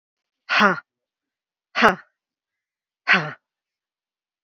exhalation_length: 4.4 s
exhalation_amplitude: 28944
exhalation_signal_mean_std_ratio: 0.28
survey_phase: beta (2021-08-13 to 2022-03-07)
age: 45-64
gender: Female
wearing_mask: 'No'
symptom_runny_or_blocked_nose: true
smoker_status: Never smoked
respiratory_condition_asthma: false
respiratory_condition_other: false
recruitment_source: REACT
submission_delay: 2 days
covid_test_result: Negative
covid_test_method: RT-qPCR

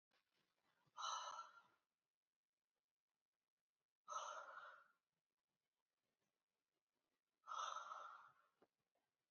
exhalation_length: 9.3 s
exhalation_amplitude: 456
exhalation_signal_mean_std_ratio: 0.36
survey_phase: beta (2021-08-13 to 2022-03-07)
age: 18-44
gender: Female
wearing_mask: 'No'
symptom_runny_or_blocked_nose: true
symptom_onset: 8 days
smoker_status: Never smoked
respiratory_condition_asthma: false
respiratory_condition_other: false
recruitment_source: REACT
submission_delay: 1 day
covid_test_result: Negative
covid_test_method: RT-qPCR
influenza_a_test_result: Negative
influenza_b_test_result: Negative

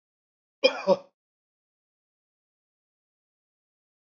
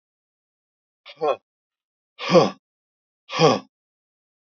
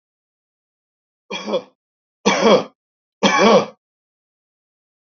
cough_length: 4.1 s
cough_amplitude: 15881
cough_signal_mean_std_ratio: 0.17
exhalation_length: 4.4 s
exhalation_amplitude: 26384
exhalation_signal_mean_std_ratio: 0.27
three_cough_length: 5.1 s
three_cough_amplitude: 29018
three_cough_signal_mean_std_ratio: 0.34
survey_phase: alpha (2021-03-01 to 2021-08-12)
age: 65+
gender: Male
wearing_mask: 'No'
symptom_none: true
smoker_status: Ex-smoker
respiratory_condition_asthma: false
respiratory_condition_other: false
recruitment_source: REACT
submission_delay: 2 days
covid_test_result: Negative
covid_test_method: RT-qPCR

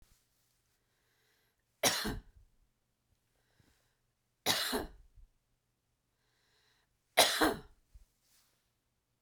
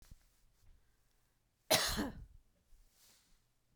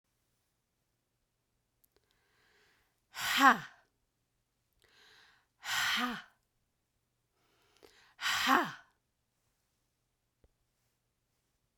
three_cough_length: 9.2 s
three_cough_amplitude: 11828
three_cough_signal_mean_std_ratio: 0.26
cough_length: 3.8 s
cough_amplitude: 5371
cough_signal_mean_std_ratio: 0.28
exhalation_length: 11.8 s
exhalation_amplitude: 11047
exhalation_signal_mean_std_ratio: 0.24
survey_phase: beta (2021-08-13 to 2022-03-07)
age: 45-64
gender: Female
wearing_mask: 'No'
symptom_none: true
smoker_status: Never smoked
respiratory_condition_asthma: false
respiratory_condition_other: false
recruitment_source: REACT
submission_delay: 2 days
covid_test_result: Negative
covid_test_method: RT-qPCR
influenza_a_test_result: Unknown/Void
influenza_b_test_result: Unknown/Void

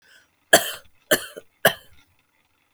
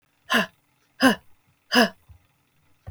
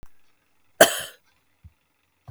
three_cough_length: 2.7 s
three_cough_amplitude: 32768
three_cough_signal_mean_std_ratio: 0.24
exhalation_length: 2.9 s
exhalation_amplitude: 19205
exhalation_signal_mean_std_ratio: 0.32
cough_length: 2.3 s
cough_amplitude: 32768
cough_signal_mean_std_ratio: 0.19
survey_phase: beta (2021-08-13 to 2022-03-07)
age: 18-44
gender: Female
wearing_mask: 'No'
symptom_abdominal_pain: true
symptom_onset: 3 days
smoker_status: Current smoker (e-cigarettes or vapes only)
respiratory_condition_asthma: false
respiratory_condition_other: false
recruitment_source: REACT
submission_delay: 1 day
covid_test_result: Negative
covid_test_method: RT-qPCR
influenza_a_test_result: Negative
influenza_b_test_result: Negative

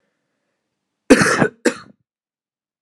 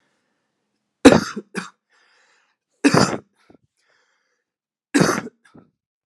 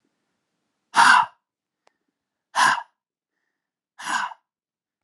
cough_length: 2.8 s
cough_amplitude: 32768
cough_signal_mean_std_ratio: 0.29
three_cough_length: 6.1 s
three_cough_amplitude: 32768
three_cough_signal_mean_std_ratio: 0.25
exhalation_length: 5.0 s
exhalation_amplitude: 27640
exhalation_signal_mean_std_ratio: 0.29
survey_phase: alpha (2021-03-01 to 2021-08-12)
age: 18-44
gender: Male
wearing_mask: 'No'
symptom_none: true
symptom_onset: 3 days
smoker_status: Never smoked
respiratory_condition_asthma: false
respiratory_condition_other: false
recruitment_source: Test and Trace
submission_delay: 1 day
covid_test_result: Positive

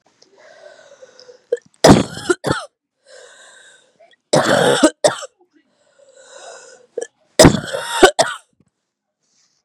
three_cough_length: 9.6 s
three_cough_amplitude: 32768
three_cough_signal_mean_std_ratio: 0.32
survey_phase: beta (2021-08-13 to 2022-03-07)
age: 18-44
gender: Female
wearing_mask: 'No'
symptom_runny_or_blocked_nose: true
symptom_onset: 5 days
smoker_status: Never smoked
respiratory_condition_asthma: false
respiratory_condition_other: false
recruitment_source: REACT
submission_delay: 4 days
covid_test_result: Negative
covid_test_method: RT-qPCR
influenza_a_test_result: Negative
influenza_b_test_result: Negative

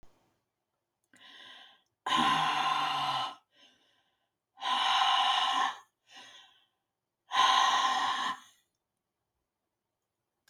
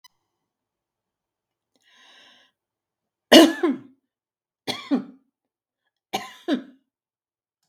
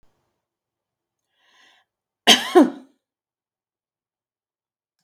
exhalation_length: 10.5 s
exhalation_amplitude: 7346
exhalation_signal_mean_std_ratio: 0.5
three_cough_length: 7.7 s
three_cough_amplitude: 32767
three_cough_signal_mean_std_ratio: 0.2
cough_length: 5.0 s
cough_amplitude: 32768
cough_signal_mean_std_ratio: 0.19
survey_phase: beta (2021-08-13 to 2022-03-07)
age: 65+
gender: Female
wearing_mask: 'No'
symptom_none: true
smoker_status: Ex-smoker
respiratory_condition_asthma: false
respiratory_condition_other: false
recruitment_source: REACT
submission_delay: 2 days
covid_test_result: Negative
covid_test_method: RT-qPCR
influenza_a_test_result: Negative
influenza_b_test_result: Negative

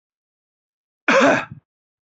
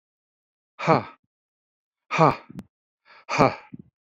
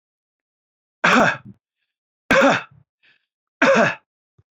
cough_length: 2.1 s
cough_amplitude: 26308
cough_signal_mean_std_ratio: 0.33
exhalation_length: 4.1 s
exhalation_amplitude: 26752
exhalation_signal_mean_std_ratio: 0.28
three_cough_length: 4.5 s
three_cough_amplitude: 25849
three_cough_signal_mean_std_ratio: 0.38
survey_phase: beta (2021-08-13 to 2022-03-07)
age: 65+
gender: Male
wearing_mask: 'No'
symptom_none: true
smoker_status: Ex-smoker
respiratory_condition_asthma: false
respiratory_condition_other: false
recruitment_source: REACT
submission_delay: 1 day
covid_test_result: Negative
covid_test_method: RT-qPCR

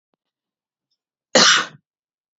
cough_length: 2.4 s
cough_amplitude: 32464
cough_signal_mean_std_ratio: 0.28
survey_phase: beta (2021-08-13 to 2022-03-07)
age: 18-44
gender: Female
wearing_mask: 'No'
symptom_none: true
smoker_status: Ex-smoker
respiratory_condition_asthma: false
respiratory_condition_other: false
recruitment_source: REACT
submission_delay: 2 days
covid_test_result: Negative
covid_test_method: RT-qPCR
influenza_a_test_result: Negative
influenza_b_test_result: Negative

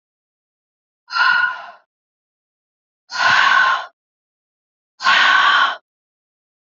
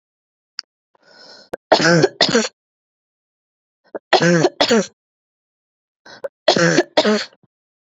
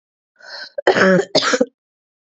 exhalation_length: 6.7 s
exhalation_amplitude: 25931
exhalation_signal_mean_std_ratio: 0.45
three_cough_length: 7.9 s
three_cough_amplitude: 30458
three_cough_signal_mean_std_ratio: 0.38
cough_length: 2.4 s
cough_amplitude: 28788
cough_signal_mean_std_ratio: 0.43
survey_phase: beta (2021-08-13 to 2022-03-07)
age: 18-44
gender: Female
wearing_mask: 'No'
symptom_cough_any: true
symptom_runny_or_blocked_nose: true
symptom_sore_throat: true
symptom_fatigue: true
symptom_headache: true
symptom_change_to_sense_of_smell_or_taste: true
smoker_status: Current smoker (e-cigarettes or vapes only)
respiratory_condition_asthma: false
respiratory_condition_other: false
recruitment_source: Test and Trace
submission_delay: 2 days
covid_test_result: Positive
covid_test_method: LAMP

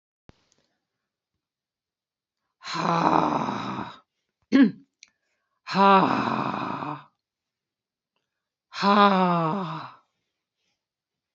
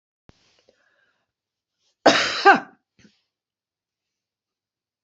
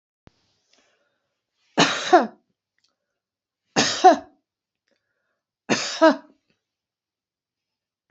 exhalation_length: 11.3 s
exhalation_amplitude: 20796
exhalation_signal_mean_std_ratio: 0.39
cough_length: 5.0 s
cough_amplitude: 30662
cough_signal_mean_std_ratio: 0.21
three_cough_length: 8.1 s
three_cough_amplitude: 27741
three_cough_signal_mean_std_ratio: 0.26
survey_phase: beta (2021-08-13 to 2022-03-07)
age: 65+
gender: Female
wearing_mask: 'No'
symptom_none: true
smoker_status: Never smoked
respiratory_condition_asthma: false
respiratory_condition_other: false
recruitment_source: REACT
submission_delay: 1 day
covid_test_result: Negative
covid_test_method: RT-qPCR
influenza_a_test_result: Negative
influenza_b_test_result: Negative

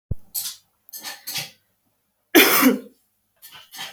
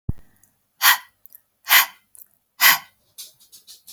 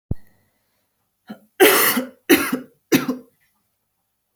cough_length: 3.9 s
cough_amplitude: 32767
cough_signal_mean_std_ratio: 0.35
exhalation_length: 3.9 s
exhalation_amplitude: 32768
exhalation_signal_mean_std_ratio: 0.3
three_cough_length: 4.4 s
three_cough_amplitude: 32767
three_cough_signal_mean_std_ratio: 0.36
survey_phase: beta (2021-08-13 to 2022-03-07)
age: 18-44
gender: Female
wearing_mask: 'No'
symptom_none: true
smoker_status: Never smoked
respiratory_condition_asthma: false
respiratory_condition_other: false
recruitment_source: REACT
submission_delay: 1 day
covid_test_result: Negative
covid_test_method: RT-qPCR
influenza_a_test_result: Negative
influenza_b_test_result: Negative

